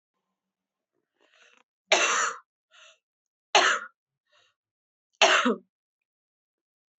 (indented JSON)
{
  "three_cough_length": "7.0 s",
  "three_cough_amplitude": 19752,
  "three_cough_signal_mean_std_ratio": 0.29,
  "survey_phase": "beta (2021-08-13 to 2022-03-07)",
  "age": "18-44",
  "gender": "Female",
  "wearing_mask": "No",
  "symptom_cough_any": true,
  "symptom_new_continuous_cough": true,
  "symptom_runny_or_blocked_nose": true,
  "symptom_sore_throat": true,
  "symptom_headache": true,
  "symptom_onset": "4 days",
  "smoker_status": "Never smoked",
  "respiratory_condition_asthma": false,
  "respiratory_condition_other": false,
  "recruitment_source": "Test and Trace",
  "submission_delay": "1 day",
  "covid_test_result": "Negative",
  "covid_test_method": "RT-qPCR"
}